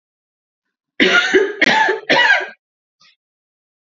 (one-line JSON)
{"three_cough_length": "3.9 s", "three_cough_amplitude": 28658, "three_cough_signal_mean_std_ratio": 0.47, "survey_phase": "beta (2021-08-13 to 2022-03-07)", "age": "18-44", "gender": "Female", "wearing_mask": "No", "symptom_runny_or_blocked_nose": true, "symptom_sore_throat": true, "symptom_onset": "6 days", "smoker_status": "Never smoked", "respiratory_condition_asthma": false, "respiratory_condition_other": false, "recruitment_source": "Test and Trace", "submission_delay": "2 days", "covid_test_result": "Negative", "covid_test_method": "RT-qPCR"}